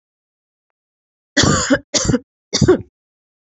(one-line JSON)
{"three_cough_length": "3.4 s", "three_cough_amplitude": 30258, "three_cough_signal_mean_std_ratio": 0.39, "survey_phase": "beta (2021-08-13 to 2022-03-07)", "age": "18-44", "gender": "Female", "wearing_mask": "No", "symptom_runny_or_blocked_nose": true, "symptom_shortness_of_breath": true, "symptom_fatigue": true, "symptom_headache": true, "symptom_other": true, "symptom_onset": "4 days", "smoker_status": "Never smoked", "respiratory_condition_asthma": false, "respiratory_condition_other": false, "recruitment_source": "Test and Trace", "submission_delay": "2 days", "covid_test_result": "Positive", "covid_test_method": "RT-qPCR", "covid_ct_value": 22.8, "covid_ct_gene": "ORF1ab gene"}